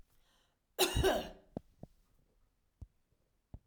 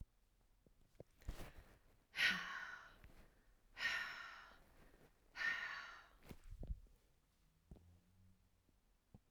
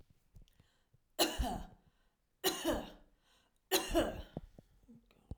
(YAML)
cough_length: 3.7 s
cough_amplitude: 5516
cough_signal_mean_std_ratio: 0.3
exhalation_length: 9.3 s
exhalation_amplitude: 1884
exhalation_signal_mean_std_ratio: 0.42
three_cough_length: 5.4 s
three_cough_amplitude: 4831
three_cough_signal_mean_std_ratio: 0.4
survey_phase: alpha (2021-03-01 to 2021-08-12)
age: 45-64
gender: Female
wearing_mask: 'No'
symptom_none: true
smoker_status: Never smoked
respiratory_condition_asthma: false
respiratory_condition_other: false
recruitment_source: REACT
submission_delay: 2 days
covid_test_result: Negative
covid_test_method: RT-qPCR